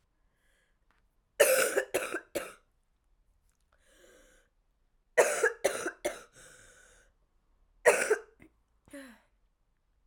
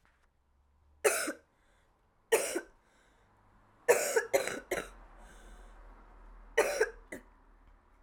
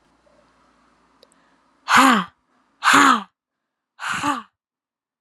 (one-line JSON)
{"cough_length": "10.1 s", "cough_amplitude": 12523, "cough_signal_mean_std_ratio": 0.3, "three_cough_length": "8.0 s", "three_cough_amplitude": 9942, "three_cough_signal_mean_std_ratio": 0.36, "exhalation_length": "5.2 s", "exhalation_amplitude": 31490, "exhalation_signal_mean_std_ratio": 0.34, "survey_phase": "alpha (2021-03-01 to 2021-08-12)", "age": "18-44", "gender": "Female", "wearing_mask": "No", "symptom_cough_any": true, "symptom_new_continuous_cough": true, "symptom_fatigue": true, "symptom_headache": true, "symptom_change_to_sense_of_smell_or_taste": true, "symptom_loss_of_taste": true, "symptom_onset": "4 days", "smoker_status": "Never smoked", "respiratory_condition_asthma": false, "respiratory_condition_other": false, "recruitment_source": "Test and Trace", "submission_delay": "1 day", "covid_test_result": "Positive", "covid_test_method": "RT-qPCR", "covid_ct_value": 19.3, "covid_ct_gene": "ORF1ab gene"}